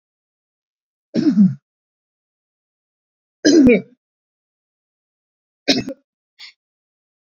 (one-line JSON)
{"three_cough_length": "7.3 s", "three_cough_amplitude": 28131, "three_cough_signal_mean_std_ratio": 0.28, "survey_phase": "beta (2021-08-13 to 2022-03-07)", "age": "65+", "gender": "Male", "wearing_mask": "No", "symptom_none": true, "smoker_status": "Never smoked", "respiratory_condition_asthma": false, "respiratory_condition_other": false, "recruitment_source": "REACT", "submission_delay": "1 day", "covid_test_result": "Negative", "covid_test_method": "RT-qPCR"}